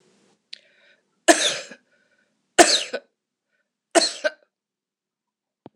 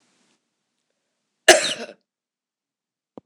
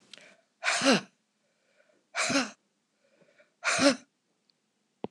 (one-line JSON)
{"three_cough_length": "5.8 s", "three_cough_amplitude": 26028, "three_cough_signal_mean_std_ratio": 0.25, "cough_length": "3.3 s", "cough_amplitude": 26028, "cough_signal_mean_std_ratio": 0.19, "exhalation_length": "5.1 s", "exhalation_amplitude": 13938, "exhalation_signal_mean_std_ratio": 0.34, "survey_phase": "beta (2021-08-13 to 2022-03-07)", "age": "45-64", "gender": "Female", "wearing_mask": "No", "symptom_fatigue": true, "symptom_headache": true, "smoker_status": "Never smoked", "respiratory_condition_asthma": false, "respiratory_condition_other": false, "recruitment_source": "REACT", "submission_delay": "2 days", "covid_test_result": "Negative", "covid_test_method": "RT-qPCR", "influenza_a_test_result": "Negative", "influenza_b_test_result": "Negative"}